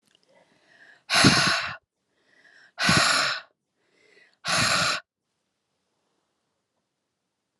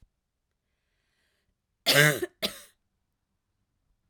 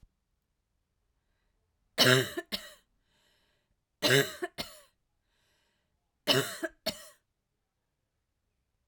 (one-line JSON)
{"exhalation_length": "7.6 s", "exhalation_amplitude": 25798, "exhalation_signal_mean_std_ratio": 0.38, "cough_length": "4.1 s", "cough_amplitude": 18957, "cough_signal_mean_std_ratio": 0.23, "three_cough_length": "8.9 s", "three_cough_amplitude": 15645, "three_cough_signal_mean_std_ratio": 0.26, "survey_phase": "alpha (2021-03-01 to 2021-08-12)", "age": "45-64", "gender": "Female", "wearing_mask": "No", "symptom_cough_any": true, "symptom_diarrhoea": true, "symptom_fatigue": true, "symptom_headache": true, "smoker_status": "Never smoked", "respiratory_condition_asthma": false, "respiratory_condition_other": false, "recruitment_source": "Test and Trace", "submission_delay": "1 day", "covid_test_result": "Positive", "covid_test_method": "RT-qPCR", "covid_ct_value": 20.6, "covid_ct_gene": "ORF1ab gene", "covid_ct_mean": 21.0, "covid_viral_load": "130000 copies/ml", "covid_viral_load_category": "Low viral load (10K-1M copies/ml)"}